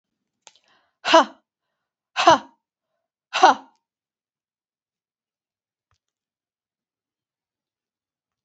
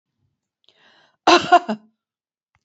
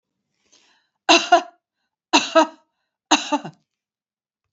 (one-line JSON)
{"exhalation_length": "8.4 s", "exhalation_amplitude": 27366, "exhalation_signal_mean_std_ratio": 0.19, "cough_length": "2.6 s", "cough_amplitude": 28196, "cough_signal_mean_std_ratio": 0.26, "three_cough_length": "4.5 s", "three_cough_amplitude": 31092, "three_cough_signal_mean_std_ratio": 0.29, "survey_phase": "beta (2021-08-13 to 2022-03-07)", "age": "45-64", "gender": "Female", "wearing_mask": "No", "symptom_none": true, "smoker_status": "Never smoked", "respiratory_condition_asthma": false, "respiratory_condition_other": false, "recruitment_source": "REACT", "submission_delay": "2 days", "covid_test_result": "Negative", "covid_test_method": "RT-qPCR", "influenza_a_test_result": "Negative", "influenza_b_test_result": "Negative"}